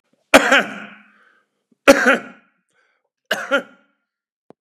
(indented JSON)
{
  "three_cough_length": "4.6 s",
  "three_cough_amplitude": 32768,
  "three_cough_signal_mean_std_ratio": 0.3,
  "survey_phase": "beta (2021-08-13 to 2022-03-07)",
  "age": "45-64",
  "gender": "Male",
  "wearing_mask": "No",
  "symptom_runny_or_blocked_nose": true,
  "symptom_fatigue": true,
  "smoker_status": "Current smoker (1 to 10 cigarettes per day)",
  "respiratory_condition_asthma": false,
  "respiratory_condition_other": false,
  "recruitment_source": "REACT",
  "submission_delay": "4 days",
  "covid_test_result": "Positive",
  "covid_test_method": "RT-qPCR",
  "covid_ct_value": 35.5,
  "covid_ct_gene": "N gene",
  "influenza_a_test_result": "Negative",
  "influenza_b_test_result": "Negative"
}